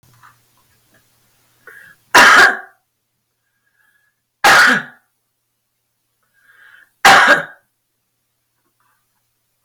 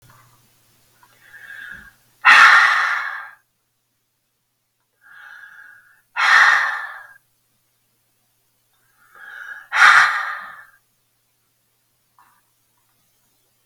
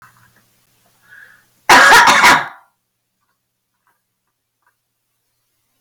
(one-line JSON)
{"three_cough_length": "9.6 s", "three_cough_amplitude": 32572, "three_cough_signal_mean_std_ratio": 0.3, "exhalation_length": "13.7 s", "exhalation_amplitude": 32572, "exhalation_signal_mean_std_ratio": 0.31, "cough_length": "5.8 s", "cough_amplitude": 32572, "cough_signal_mean_std_ratio": 0.32, "survey_phase": "beta (2021-08-13 to 2022-03-07)", "age": "45-64", "gender": "Female", "wearing_mask": "No", "symptom_none": true, "smoker_status": "Ex-smoker", "respiratory_condition_asthma": false, "respiratory_condition_other": false, "recruitment_source": "REACT", "submission_delay": "5 days", "covid_test_result": "Negative", "covid_test_method": "RT-qPCR", "influenza_a_test_result": "Negative", "influenza_b_test_result": "Negative"}